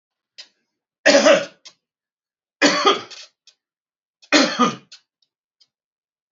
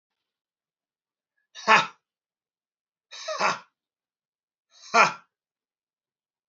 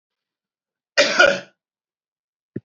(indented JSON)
{
  "three_cough_length": "6.3 s",
  "three_cough_amplitude": 29288,
  "three_cough_signal_mean_std_ratio": 0.33,
  "exhalation_length": "6.5 s",
  "exhalation_amplitude": 25124,
  "exhalation_signal_mean_std_ratio": 0.22,
  "cough_length": "2.6 s",
  "cough_amplitude": 31533,
  "cough_signal_mean_std_ratio": 0.28,
  "survey_phase": "alpha (2021-03-01 to 2021-08-12)",
  "age": "65+",
  "gender": "Male",
  "wearing_mask": "No",
  "symptom_none": true,
  "smoker_status": "Ex-smoker",
  "respiratory_condition_asthma": false,
  "respiratory_condition_other": false,
  "recruitment_source": "REACT",
  "submission_delay": "2 days",
  "covid_test_result": "Negative",
  "covid_test_method": "RT-qPCR"
}